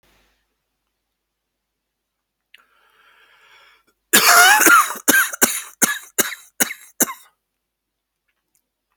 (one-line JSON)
{"cough_length": "9.0 s", "cough_amplitude": 32768, "cough_signal_mean_std_ratio": 0.32, "survey_phase": "beta (2021-08-13 to 2022-03-07)", "age": "45-64", "gender": "Male", "wearing_mask": "No", "symptom_none": true, "smoker_status": "Never smoked", "respiratory_condition_asthma": false, "respiratory_condition_other": false, "recruitment_source": "REACT", "submission_delay": "0 days", "covid_test_result": "Negative", "covid_test_method": "RT-qPCR"}